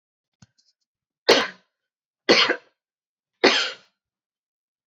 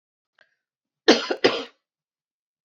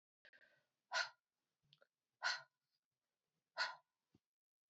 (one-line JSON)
{"three_cough_length": "4.9 s", "three_cough_amplitude": 25539, "three_cough_signal_mean_std_ratio": 0.28, "cough_length": "2.6 s", "cough_amplitude": 28970, "cough_signal_mean_std_ratio": 0.25, "exhalation_length": "4.7 s", "exhalation_amplitude": 1346, "exhalation_signal_mean_std_ratio": 0.25, "survey_phase": "beta (2021-08-13 to 2022-03-07)", "age": "45-64", "gender": "Female", "wearing_mask": "No", "symptom_runny_or_blocked_nose": true, "symptom_sore_throat": true, "symptom_fatigue": true, "symptom_headache": true, "symptom_other": true, "smoker_status": "Never smoked", "respiratory_condition_asthma": false, "respiratory_condition_other": false, "recruitment_source": "Test and Trace", "submission_delay": "1 day", "covid_test_result": "Negative", "covid_test_method": "RT-qPCR"}